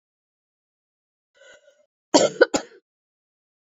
cough_length: 3.7 s
cough_amplitude: 27029
cough_signal_mean_std_ratio: 0.2
survey_phase: beta (2021-08-13 to 2022-03-07)
age: 65+
gender: Female
wearing_mask: 'No'
symptom_cough_any: true
symptom_runny_or_blocked_nose: true
symptom_fatigue: true
symptom_headache: true
symptom_change_to_sense_of_smell_or_taste: true
smoker_status: Never smoked
respiratory_condition_asthma: false
respiratory_condition_other: false
recruitment_source: Test and Trace
submission_delay: 1 day
covid_test_result: Positive
covid_test_method: RT-qPCR
covid_ct_value: 14.2
covid_ct_gene: S gene
covid_ct_mean: 14.6
covid_viral_load: 16000000 copies/ml
covid_viral_load_category: High viral load (>1M copies/ml)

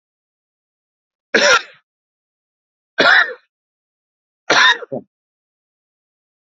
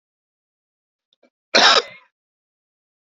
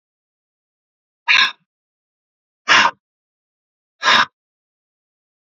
three_cough_length: 6.6 s
three_cough_amplitude: 32768
three_cough_signal_mean_std_ratio: 0.29
cough_length: 3.2 s
cough_amplitude: 29183
cough_signal_mean_std_ratio: 0.23
exhalation_length: 5.5 s
exhalation_amplitude: 32768
exhalation_signal_mean_std_ratio: 0.27
survey_phase: beta (2021-08-13 to 2022-03-07)
age: 45-64
gender: Male
wearing_mask: 'No'
symptom_cough_any: true
symptom_onset: 3 days
smoker_status: Never smoked
respiratory_condition_asthma: false
respiratory_condition_other: false
recruitment_source: Test and Trace
submission_delay: 1 day
covid_test_result: Positive
covid_test_method: RT-qPCR
covid_ct_value: 31.6
covid_ct_gene: ORF1ab gene
covid_ct_mean: 32.4
covid_viral_load: 24 copies/ml
covid_viral_load_category: Minimal viral load (< 10K copies/ml)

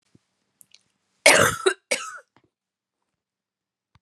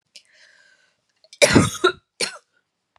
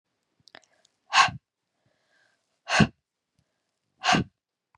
cough_length: 4.0 s
cough_amplitude: 32682
cough_signal_mean_std_ratio: 0.25
three_cough_length: 3.0 s
three_cough_amplitude: 32474
three_cough_signal_mean_std_ratio: 0.29
exhalation_length: 4.8 s
exhalation_amplitude: 20062
exhalation_signal_mean_std_ratio: 0.25
survey_phase: beta (2021-08-13 to 2022-03-07)
age: 45-64
gender: Female
wearing_mask: 'No'
symptom_cough_any: true
symptom_runny_or_blocked_nose: true
symptom_other: true
symptom_onset: 7 days
smoker_status: Never smoked
respiratory_condition_asthma: false
respiratory_condition_other: false
recruitment_source: REACT
submission_delay: 1 day
covid_test_result: Negative
covid_test_method: RT-qPCR
influenza_a_test_result: Unknown/Void
influenza_b_test_result: Unknown/Void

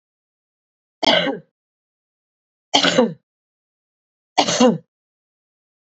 three_cough_length: 5.8 s
three_cough_amplitude: 28367
three_cough_signal_mean_std_ratio: 0.32
survey_phase: beta (2021-08-13 to 2022-03-07)
age: 18-44
gender: Female
wearing_mask: 'No'
symptom_cough_any: true
symptom_change_to_sense_of_smell_or_taste: true
symptom_onset: 1 day
smoker_status: Never smoked
respiratory_condition_asthma: false
respiratory_condition_other: false
recruitment_source: Test and Trace
submission_delay: 1 day
covid_test_result: Negative
covid_test_method: RT-qPCR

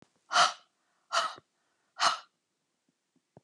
exhalation_length: 3.4 s
exhalation_amplitude: 10318
exhalation_signal_mean_std_ratio: 0.3
survey_phase: beta (2021-08-13 to 2022-03-07)
age: 65+
gender: Female
wearing_mask: 'No'
symptom_runny_or_blocked_nose: true
smoker_status: Never smoked
respiratory_condition_asthma: true
respiratory_condition_other: false
recruitment_source: REACT
submission_delay: 2 days
covid_test_result: Negative
covid_test_method: RT-qPCR
influenza_a_test_result: Negative
influenza_b_test_result: Negative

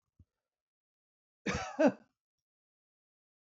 cough_length: 3.5 s
cough_amplitude: 6438
cough_signal_mean_std_ratio: 0.22
survey_phase: beta (2021-08-13 to 2022-03-07)
age: 65+
gender: Male
wearing_mask: 'No'
symptom_diarrhoea: true
symptom_fatigue: true
symptom_onset: 12 days
smoker_status: Never smoked
respiratory_condition_asthma: false
respiratory_condition_other: false
recruitment_source: REACT
submission_delay: 3 days
covid_test_result: Negative
covid_test_method: RT-qPCR
influenza_a_test_result: Negative
influenza_b_test_result: Negative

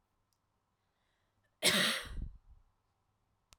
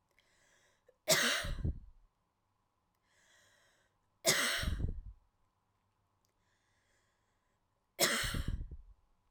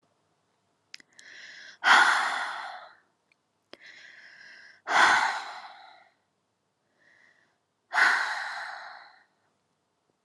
cough_length: 3.6 s
cough_amplitude: 6197
cough_signal_mean_std_ratio: 0.31
three_cough_length: 9.3 s
three_cough_amplitude: 7754
three_cough_signal_mean_std_ratio: 0.38
exhalation_length: 10.2 s
exhalation_amplitude: 17899
exhalation_signal_mean_std_ratio: 0.35
survey_phase: alpha (2021-03-01 to 2021-08-12)
age: 18-44
gender: Female
wearing_mask: 'No'
symptom_none: true
smoker_status: Ex-smoker
respiratory_condition_asthma: false
respiratory_condition_other: false
recruitment_source: REACT
submission_delay: 2 days
covid_test_result: Negative
covid_test_method: RT-qPCR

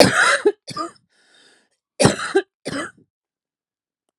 cough_length: 4.2 s
cough_amplitude: 32768
cough_signal_mean_std_ratio: 0.37
survey_phase: alpha (2021-03-01 to 2021-08-12)
age: 45-64
gender: Female
wearing_mask: 'No'
symptom_cough_any: true
symptom_shortness_of_breath: true
symptom_headache: true
symptom_onset: 8 days
smoker_status: Current smoker (11 or more cigarettes per day)
respiratory_condition_asthma: false
respiratory_condition_other: false
recruitment_source: Test and Trace
submission_delay: 2 days
covid_test_result: Positive
covid_test_method: RT-qPCR
covid_ct_value: 14.9
covid_ct_gene: N gene
covid_ct_mean: 14.9
covid_viral_load: 13000000 copies/ml
covid_viral_load_category: High viral load (>1M copies/ml)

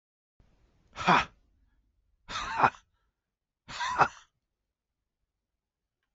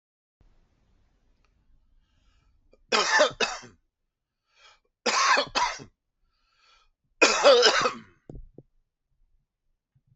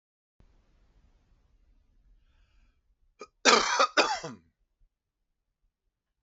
exhalation_length: 6.1 s
exhalation_amplitude: 13455
exhalation_signal_mean_std_ratio: 0.26
three_cough_length: 10.2 s
three_cough_amplitude: 17390
three_cough_signal_mean_std_ratio: 0.33
cough_length: 6.2 s
cough_amplitude: 18966
cough_signal_mean_std_ratio: 0.24
survey_phase: alpha (2021-03-01 to 2021-08-12)
age: 45-64
gender: Male
wearing_mask: 'No'
symptom_none: true
symptom_cough_any: true
smoker_status: Never smoked
respiratory_condition_asthma: false
respiratory_condition_other: false
recruitment_source: Test and Trace
submission_delay: 0 days
covid_test_result: Negative
covid_test_method: LFT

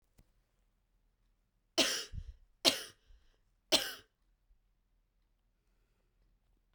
three_cough_length: 6.7 s
three_cough_amplitude: 11483
three_cough_signal_mean_std_ratio: 0.23
survey_phase: beta (2021-08-13 to 2022-03-07)
age: 18-44
gender: Female
wearing_mask: 'No'
symptom_cough_any: true
symptom_new_continuous_cough: true
symptom_runny_or_blocked_nose: true
symptom_sore_throat: true
symptom_fatigue: true
symptom_fever_high_temperature: true
symptom_headache: true
symptom_onset: 3 days
smoker_status: Never smoked
respiratory_condition_asthma: false
respiratory_condition_other: false
recruitment_source: Test and Trace
submission_delay: 1 day
covid_test_result: Positive
covid_test_method: RT-qPCR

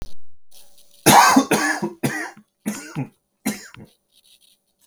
cough_length: 4.9 s
cough_amplitude: 32768
cough_signal_mean_std_ratio: 0.43
survey_phase: beta (2021-08-13 to 2022-03-07)
age: 18-44
gender: Male
wearing_mask: 'No'
symptom_cough_any: true
smoker_status: Never smoked
respiratory_condition_asthma: false
respiratory_condition_other: false
recruitment_source: REACT
submission_delay: 1 day
covid_test_result: Negative
covid_test_method: RT-qPCR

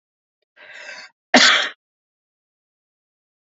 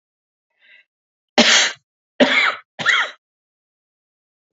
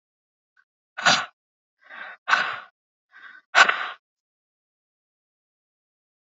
cough_length: 3.6 s
cough_amplitude: 31144
cough_signal_mean_std_ratio: 0.25
three_cough_length: 4.5 s
three_cough_amplitude: 29825
three_cough_signal_mean_std_ratio: 0.36
exhalation_length: 6.4 s
exhalation_amplitude: 27982
exhalation_signal_mean_std_ratio: 0.25
survey_phase: beta (2021-08-13 to 2022-03-07)
age: 45-64
gender: Male
wearing_mask: 'No'
symptom_cough_any: true
symptom_runny_or_blocked_nose: true
symptom_onset: 13 days
smoker_status: Never smoked
respiratory_condition_asthma: false
respiratory_condition_other: false
recruitment_source: REACT
submission_delay: 1 day
covid_test_result: Negative
covid_test_method: RT-qPCR
influenza_a_test_result: Unknown/Void
influenza_b_test_result: Unknown/Void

